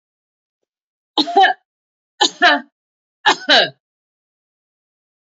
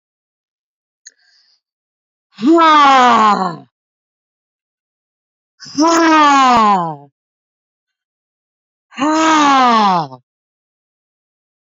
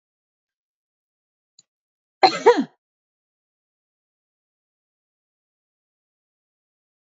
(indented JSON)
{
  "three_cough_length": "5.3 s",
  "three_cough_amplitude": 29359,
  "three_cough_signal_mean_std_ratio": 0.31,
  "exhalation_length": "11.7 s",
  "exhalation_amplitude": 28709,
  "exhalation_signal_mean_std_ratio": 0.47,
  "cough_length": "7.2 s",
  "cough_amplitude": 27554,
  "cough_signal_mean_std_ratio": 0.14,
  "survey_phase": "beta (2021-08-13 to 2022-03-07)",
  "age": "45-64",
  "gender": "Female",
  "wearing_mask": "No",
  "symptom_none": true,
  "smoker_status": "Ex-smoker",
  "respiratory_condition_asthma": false,
  "respiratory_condition_other": false,
  "recruitment_source": "REACT",
  "submission_delay": "1 day",
  "covid_test_result": "Negative",
  "covid_test_method": "RT-qPCR"
}